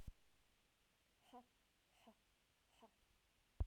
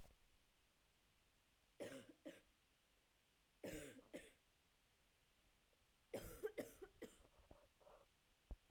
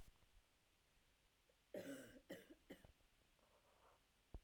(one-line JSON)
{"exhalation_length": "3.7 s", "exhalation_amplitude": 985, "exhalation_signal_mean_std_ratio": 0.21, "three_cough_length": "8.7 s", "three_cough_amplitude": 525, "three_cough_signal_mean_std_ratio": 0.41, "cough_length": "4.4 s", "cough_amplitude": 332, "cough_signal_mean_std_ratio": 0.47, "survey_phase": "alpha (2021-03-01 to 2021-08-12)", "age": "18-44", "gender": "Female", "wearing_mask": "No", "symptom_cough_any": true, "symptom_fever_high_temperature": true, "symptom_headache": true, "smoker_status": "Never smoked", "respiratory_condition_asthma": false, "respiratory_condition_other": false, "recruitment_source": "Test and Trace", "submission_delay": "2 days", "covid_test_result": "Positive", "covid_test_method": "RT-qPCR", "covid_ct_value": 34.6, "covid_ct_gene": "ORF1ab gene"}